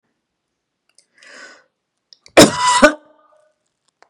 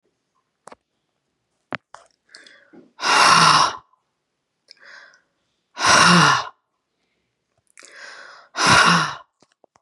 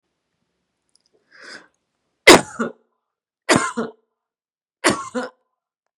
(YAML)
cough_length: 4.1 s
cough_amplitude: 32768
cough_signal_mean_std_ratio: 0.26
exhalation_length: 9.8 s
exhalation_amplitude: 29336
exhalation_signal_mean_std_ratio: 0.37
three_cough_length: 6.0 s
three_cough_amplitude: 32768
three_cough_signal_mean_std_ratio: 0.23
survey_phase: beta (2021-08-13 to 2022-03-07)
age: 45-64
gender: Female
wearing_mask: 'No'
symptom_cough_any: true
smoker_status: Never smoked
respiratory_condition_asthma: false
respiratory_condition_other: false
recruitment_source: REACT
submission_delay: 3 days
covid_test_result: Negative
covid_test_method: RT-qPCR
influenza_a_test_result: Negative
influenza_b_test_result: Negative